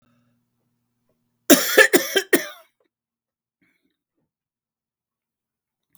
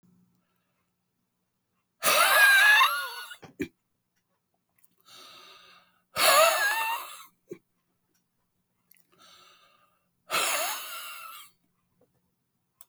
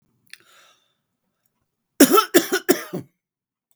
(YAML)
cough_length: 6.0 s
cough_amplitude: 32768
cough_signal_mean_std_ratio: 0.22
exhalation_length: 12.9 s
exhalation_amplitude: 13131
exhalation_signal_mean_std_ratio: 0.36
three_cough_length: 3.8 s
three_cough_amplitude: 32768
three_cough_signal_mean_std_ratio: 0.27
survey_phase: beta (2021-08-13 to 2022-03-07)
age: 65+
gender: Male
wearing_mask: 'No'
symptom_fatigue: true
smoker_status: Ex-smoker
respiratory_condition_asthma: false
respiratory_condition_other: false
recruitment_source: REACT
submission_delay: 1 day
covid_test_result: Negative
covid_test_method: RT-qPCR
influenza_a_test_result: Unknown/Void
influenza_b_test_result: Unknown/Void